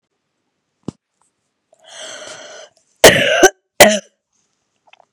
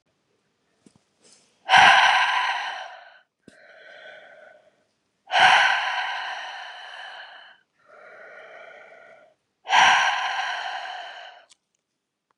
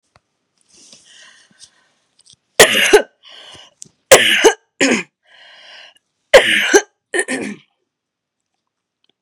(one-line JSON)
{"cough_length": "5.1 s", "cough_amplitude": 32768, "cough_signal_mean_std_ratio": 0.28, "exhalation_length": "12.4 s", "exhalation_amplitude": 26766, "exhalation_signal_mean_std_ratio": 0.4, "three_cough_length": "9.2 s", "three_cough_amplitude": 32768, "three_cough_signal_mean_std_ratio": 0.32, "survey_phase": "beta (2021-08-13 to 2022-03-07)", "age": "45-64", "gender": "Female", "wearing_mask": "No", "symptom_fatigue": true, "symptom_headache": true, "symptom_onset": "12 days", "smoker_status": "Never smoked", "respiratory_condition_asthma": false, "respiratory_condition_other": false, "recruitment_source": "REACT", "submission_delay": "2 days", "covid_test_result": "Negative", "covid_test_method": "RT-qPCR", "influenza_a_test_result": "Negative", "influenza_b_test_result": "Negative"}